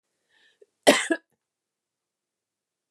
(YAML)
cough_length: 2.9 s
cough_amplitude: 27342
cough_signal_mean_std_ratio: 0.19
survey_phase: beta (2021-08-13 to 2022-03-07)
age: 45-64
gender: Female
wearing_mask: 'No'
symptom_cough_any: true
symptom_onset: 8 days
smoker_status: Never smoked
respiratory_condition_asthma: false
respiratory_condition_other: false
recruitment_source: REACT
submission_delay: 2 days
covid_test_result: Negative
covid_test_method: RT-qPCR
influenza_a_test_result: Negative
influenza_b_test_result: Negative